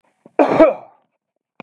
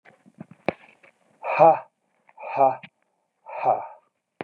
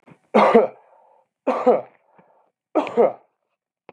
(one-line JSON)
{"cough_length": "1.6 s", "cough_amplitude": 32768, "cough_signal_mean_std_ratio": 0.36, "exhalation_length": "4.4 s", "exhalation_amplitude": 26030, "exhalation_signal_mean_std_ratio": 0.32, "three_cough_length": "3.9 s", "three_cough_amplitude": 31868, "three_cough_signal_mean_std_ratio": 0.37, "survey_phase": "beta (2021-08-13 to 2022-03-07)", "age": "45-64", "gender": "Male", "wearing_mask": "No", "symptom_none": true, "smoker_status": "Never smoked", "respiratory_condition_asthma": false, "respiratory_condition_other": false, "recruitment_source": "REACT", "submission_delay": "1 day", "covid_test_result": "Negative", "covid_test_method": "RT-qPCR", "influenza_a_test_result": "Negative", "influenza_b_test_result": "Negative"}